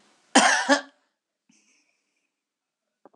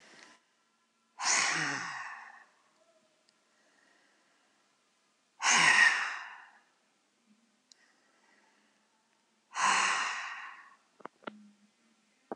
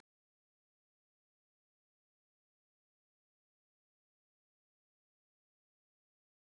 {"cough_length": "3.2 s", "cough_amplitude": 23290, "cough_signal_mean_std_ratio": 0.28, "exhalation_length": "12.4 s", "exhalation_amplitude": 9352, "exhalation_signal_mean_std_ratio": 0.35, "three_cough_length": "6.5 s", "three_cough_amplitude": 81, "three_cough_signal_mean_std_ratio": 0.02, "survey_phase": "alpha (2021-03-01 to 2021-08-12)", "age": "65+", "gender": "Female", "wearing_mask": "No", "symptom_none": true, "smoker_status": "Ex-smoker", "respiratory_condition_asthma": false, "respiratory_condition_other": false, "recruitment_source": "REACT", "submission_delay": "3 days", "covid_test_result": "Negative", "covid_test_method": "RT-qPCR"}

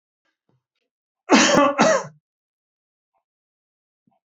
{"cough_length": "4.3 s", "cough_amplitude": 31042, "cough_signal_mean_std_ratio": 0.32, "survey_phase": "beta (2021-08-13 to 2022-03-07)", "age": "65+", "gender": "Male", "wearing_mask": "No", "symptom_none": true, "smoker_status": "Ex-smoker", "respiratory_condition_asthma": false, "respiratory_condition_other": false, "recruitment_source": "REACT", "submission_delay": "0 days", "covid_test_result": "Negative", "covid_test_method": "RT-qPCR", "influenza_a_test_result": "Negative", "influenza_b_test_result": "Negative"}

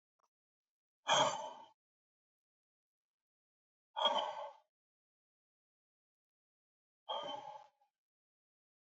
{"exhalation_length": "9.0 s", "exhalation_amplitude": 3886, "exhalation_signal_mean_std_ratio": 0.27, "survey_phase": "alpha (2021-03-01 to 2021-08-12)", "age": "45-64", "gender": "Male", "wearing_mask": "No", "symptom_cough_any": true, "symptom_abdominal_pain": true, "symptom_fatigue": true, "symptom_fever_high_temperature": true, "symptom_change_to_sense_of_smell_or_taste": true, "symptom_onset": "6 days", "smoker_status": "Ex-smoker", "respiratory_condition_asthma": false, "respiratory_condition_other": false, "recruitment_source": "Test and Trace", "submission_delay": "1 day", "covid_test_result": "Positive", "covid_test_method": "RT-qPCR", "covid_ct_value": 18.9, "covid_ct_gene": "ORF1ab gene", "covid_ct_mean": 19.7, "covid_viral_load": "330000 copies/ml", "covid_viral_load_category": "Low viral load (10K-1M copies/ml)"}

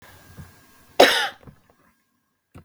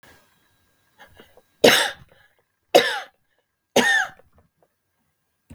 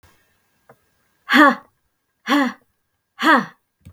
{"cough_length": "2.6 s", "cough_amplitude": 32768, "cough_signal_mean_std_ratio": 0.25, "three_cough_length": "5.5 s", "three_cough_amplitude": 32768, "three_cough_signal_mean_std_ratio": 0.29, "exhalation_length": "3.9 s", "exhalation_amplitude": 32766, "exhalation_signal_mean_std_ratio": 0.34, "survey_phase": "beta (2021-08-13 to 2022-03-07)", "age": "65+", "gender": "Female", "wearing_mask": "No", "symptom_none": true, "smoker_status": "Never smoked", "respiratory_condition_asthma": true, "respiratory_condition_other": false, "recruitment_source": "REACT", "submission_delay": "1 day", "covid_test_result": "Negative", "covid_test_method": "RT-qPCR"}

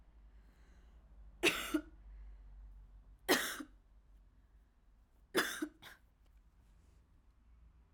{"three_cough_length": "7.9 s", "three_cough_amplitude": 5050, "three_cough_signal_mean_std_ratio": 0.34, "survey_phase": "alpha (2021-03-01 to 2021-08-12)", "age": "18-44", "gender": "Female", "wearing_mask": "No", "symptom_fatigue": true, "symptom_headache": true, "smoker_status": "Never smoked", "respiratory_condition_asthma": false, "respiratory_condition_other": false, "recruitment_source": "Test and Trace", "submission_delay": "1 day", "covid_test_result": "Positive", "covid_test_method": "RT-qPCR", "covid_ct_value": 30.0, "covid_ct_gene": "ORF1ab gene"}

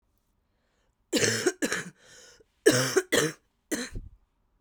{"cough_length": "4.6 s", "cough_amplitude": 17601, "cough_signal_mean_std_ratio": 0.41, "survey_phase": "beta (2021-08-13 to 2022-03-07)", "age": "18-44", "gender": "Female", "wearing_mask": "No", "symptom_cough_any": true, "symptom_new_continuous_cough": true, "symptom_runny_or_blocked_nose": true, "symptom_headache": true, "symptom_other": true, "smoker_status": "Ex-smoker", "respiratory_condition_asthma": true, "respiratory_condition_other": false, "recruitment_source": "Test and Trace", "submission_delay": "2 days", "covid_test_result": "Positive", "covid_test_method": "ePCR"}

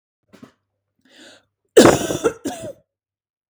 {"cough_length": "3.5 s", "cough_amplitude": 32768, "cough_signal_mean_std_ratio": 0.27, "survey_phase": "beta (2021-08-13 to 2022-03-07)", "age": "18-44", "gender": "Female", "wearing_mask": "No", "symptom_none": true, "smoker_status": "Current smoker (1 to 10 cigarettes per day)", "respiratory_condition_asthma": false, "respiratory_condition_other": false, "recruitment_source": "REACT", "submission_delay": "4 days", "covid_test_result": "Negative", "covid_test_method": "RT-qPCR", "influenza_a_test_result": "Negative", "influenza_b_test_result": "Negative"}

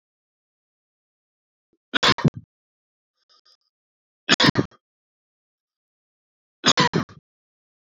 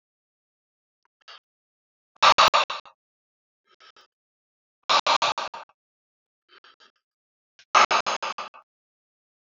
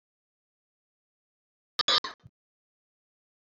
{"three_cough_length": "7.9 s", "three_cough_amplitude": 26506, "three_cough_signal_mean_std_ratio": 0.23, "exhalation_length": "9.5 s", "exhalation_amplitude": 23143, "exhalation_signal_mean_std_ratio": 0.27, "cough_length": "3.6 s", "cough_amplitude": 10002, "cough_signal_mean_std_ratio": 0.17, "survey_phase": "beta (2021-08-13 to 2022-03-07)", "age": "18-44", "gender": "Male", "wearing_mask": "No", "symptom_none": true, "smoker_status": "Never smoked", "respiratory_condition_asthma": false, "respiratory_condition_other": false, "recruitment_source": "REACT", "submission_delay": "1 day", "covid_test_result": "Negative", "covid_test_method": "RT-qPCR", "influenza_a_test_result": "Unknown/Void", "influenza_b_test_result": "Unknown/Void"}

